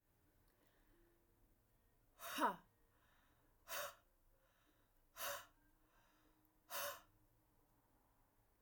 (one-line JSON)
{"exhalation_length": "8.6 s", "exhalation_amplitude": 1617, "exhalation_signal_mean_std_ratio": 0.3, "survey_phase": "alpha (2021-03-01 to 2021-08-12)", "age": "45-64", "gender": "Female", "wearing_mask": "No", "symptom_fatigue": true, "symptom_headache": true, "smoker_status": "Never smoked", "respiratory_condition_asthma": false, "respiratory_condition_other": false, "recruitment_source": "REACT", "submission_delay": "2 days", "covid_test_result": "Negative", "covid_test_method": "RT-qPCR"}